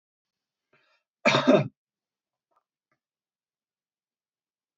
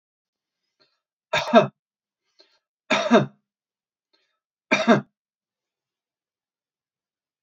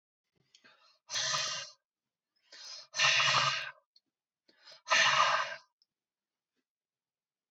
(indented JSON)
{
  "cough_length": "4.8 s",
  "cough_amplitude": 15713,
  "cough_signal_mean_std_ratio": 0.21,
  "three_cough_length": "7.4 s",
  "three_cough_amplitude": 27574,
  "three_cough_signal_mean_std_ratio": 0.24,
  "exhalation_length": "7.5 s",
  "exhalation_amplitude": 7689,
  "exhalation_signal_mean_std_ratio": 0.4,
  "survey_phase": "beta (2021-08-13 to 2022-03-07)",
  "age": "65+",
  "gender": "Male",
  "wearing_mask": "No",
  "symptom_none": true,
  "smoker_status": "Never smoked",
  "respiratory_condition_asthma": false,
  "respiratory_condition_other": false,
  "recruitment_source": "REACT",
  "submission_delay": "1 day",
  "covid_test_result": "Negative",
  "covid_test_method": "RT-qPCR"
}